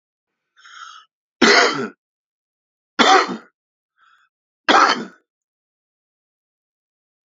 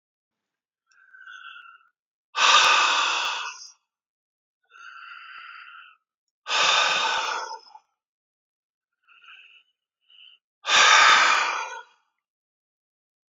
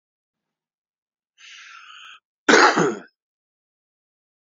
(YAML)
three_cough_length: 7.3 s
three_cough_amplitude: 30240
three_cough_signal_mean_std_ratio: 0.3
exhalation_length: 13.3 s
exhalation_amplitude: 23808
exhalation_signal_mean_std_ratio: 0.39
cough_length: 4.4 s
cough_amplitude: 28603
cough_signal_mean_std_ratio: 0.25
survey_phase: alpha (2021-03-01 to 2021-08-12)
age: 65+
gender: Male
wearing_mask: 'No'
symptom_cough_any: true
symptom_fatigue: true
smoker_status: Ex-smoker
respiratory_condition_asthma: false
respiratory_condition_other: false
recruitment_source: Test and Trace
submission_delay: 1 day
covid_test_result: Positive
covid_test_method: LFT